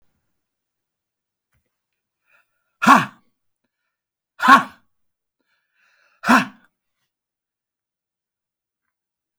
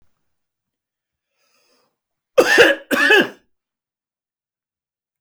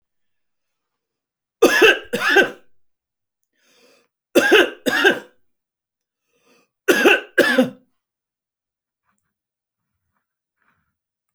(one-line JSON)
{"exhalation_length": "9.4 s", "exhalation_amplitude": 31578, "exhalation_signal_mean_std_ratio": 0.19, "cough_length": "5.2 s", "cough_amplitude": 30645, "cough_signal_mean_std_ratio": 0.29, "three_cough_length": "11.3 s", "three_cough_amplitude": 30597, "three_cough_signal_mean_std_ratio": 0.32, "survey_phase": "beta (2021-08-13 to 2022-03-07)", "age": "65+", "gender": "Male", "wearing_mask": "No", "symptom_none": true, "smoker_status": "Never smoked", "respiratory_condition_asthma": false, "respiratory_condition_other": false, "recruitment_source": "REACT", "submission_delay": "1 day", "covid_test_result": "Negative", "covid_test_method": "RT-qPCR"}